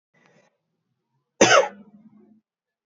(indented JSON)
{
  "cough_length": "3.0 s",
  "cough_amplitude": 26694,
  "cough_signal_mean_std_ratio": 0.24,
  "survey_phase": "alpha (2021-03-01 to 2021-08-12)",
  "age": "18-44",
  "gender": "Male",
  "wearing_mask": "No",
  "symptom_none": true,
  "smoker_status": "Never smoked",
  "respiratory_condition_asthma": false,
  "respiratory_condition_other": false,
  "recruitment_source": "REACT",
  "submission_delay": "1 day",
  "covid_test_result": "Negative",
  "covid_test_method": "RT-qPCR"
}